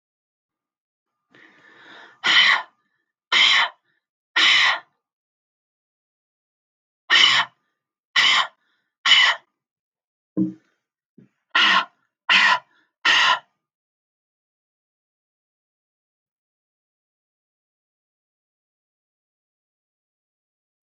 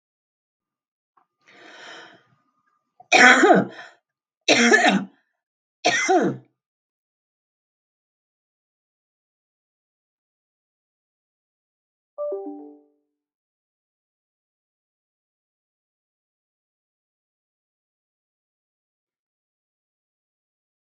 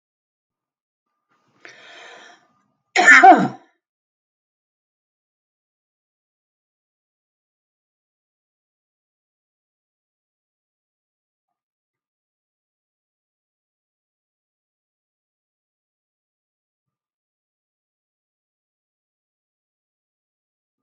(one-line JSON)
{"exhalation_length": "20.8 s", "exhalation_amplitude": 26191, "exhalation_signal_mean_std_ratio": 0.32, "three_cough_length": "21.0 s", "three_cough_amplitude": 32766, "three_cough_signal_mean_std_ratio": 0.22, "cough_length": "20.8 s", "cough_amplitude": 32768, "cough_signal_mean_std_ratio": 0.12, "survey_phase": "beta (2021-08-13 to 2022-03-07)", "age": "45-64", "gender": "Female", "wearing_mask": "No", "symptom_headache": true, "smoker_status": "Ex-smoker", "respiratory_condition_asthma": false, "respiratory_condition_other": true, "recruitment_source": "REACT", "submission_delay": "4 days", "covid_test_result": "Positive", "covid_test_method": "RT-qPCR", "covid_ct_value": 36.0, "covid_ct_gene": "N gene", "influenza_a_test_result": "Negative", "influenza_b_test_result": "Negative"}